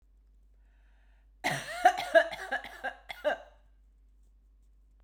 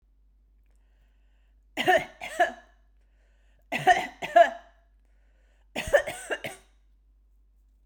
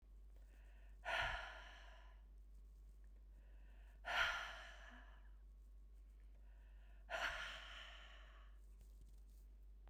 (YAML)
cough_length: 5.0 s
cough_amplitude: 11680
cough_signal_mean_std_ratio: 0.32
three_cough_length: 7.9 s
three_cough_amplitude: 15192
three_cough_signal_mean_std_ratio: 0.29
exhalation_length: 9.9 s
exhalation_amplitude: 1575
exhalation_signal_mean_std_ratio: 0.65
survey_phase: beta (2021-08-13 to 2022-03-07)
age: 45-64
gender: Female
wearing_mask: 'No'
symptom_runny_or_blocked_nose: true
symptom_sore_throat: true
symptom_fatigue: true
symptom_headache: true
symptom_onset: 4 days
smoker_status: Never smoked
respiratory_condition_asthma: false
respiratory_condition_other: false
recruitment_source: Test and Trace
submission_delay: 3 days
covid_test_result: Positive
covid_test_method: RT-qPCR
covid_ct_value: 18.2
covid_ct_gene: ORF1ab gene